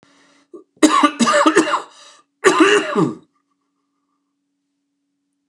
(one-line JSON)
{"three_cough_length": "5.5 s", "three_cough_amplitude": 29204, "three_cough_signal_mean_std_ratio": 0.42, "survey_phase": "beta (2021-08-13 to 2022-03-07)", "age": "65+", "gender": "Male", "wearing_mask": "No", "symptom_cough_any": true, "symptom_runny_or_blocked_nose": true, "symptom_change_to_sense_of_smell_or_taste": true, "symptom_onset": "3 days", "smoker_status": "Never smoked", "respiratory_condition_asthma": true, "respiratory_condition_other": false, "recruitment_source": "Test and Trace", "submission_delay": "1 day", "covid_test_result": "Positive", "covid_test_method": "RT-qPCR", "covid_ct_value": 16.1, "covid_ct_gene": "ORF1ab gene", "covid_ct_mean": 16.6, "covid_viral_load": "3600000 copies/ml", "covid_viral_load_category": "High viral load (>1M copies/ml)"}